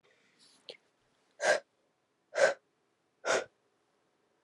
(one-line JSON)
{"exhalation_length": "4.4 s", "exhalation_amplitude": 7289, "exhalation_signal_mean_std_ratio": 0.28, "survey_phase": "beta (2021-08-13 to 2022-03-07)", "age": "18-44", "gender": "Female", "wearing_mask": "No", "symptom_cough_any": true, "symptom_runny_or_blocked_nose": true, "symptom_sore_throat": true, "symptom_headache": true, "symptom_onset": "3 days", "smoker_status": "Ex-smoker", "respiratory_condition_asthma": false, "respiratory_condition_other": false, "recruitment_source": "Test and Trace", "submission_delay": "1 day", "covid_test_result": "Positive", "covid_test_method": "RT-qPCR"}